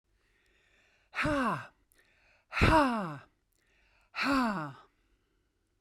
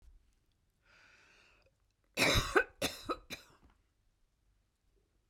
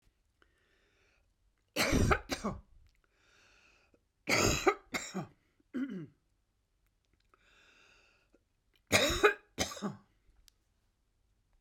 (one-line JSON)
{"exhalation_length": "5.8 s", "exhalation_amplitude": 10700, "exhalation_signal_mean_std_ratio": 0.42, "cough_length": "5.3 s", "cough_amplitude": 6368, "cough_signal_mean_std_ratio": 0.28, "three_cough_length": "11.6 s", "three_cough_amplitude": 8870, "three_cough_signal_mean_std_ratio": 0.33, "survey_phase": "beta (2021-08-13 to 2022-03-07)", "age": "65+", "gender": "Female", "wearing_mask": "No", "symptom_runny_or_blocked_nose": true, "smoker_status": "Ex-smoker", "respiratory_condition_asthma": false, "respiratory_condition_other": false, "recruitment_source": "REACT", "submission_delay": "2 days", "covid_test_result": "Negative", "covid_test_method": "RT-qPCR", "influenza_a_test_result": "Negative", "influenza_b_test_result": "Negative"}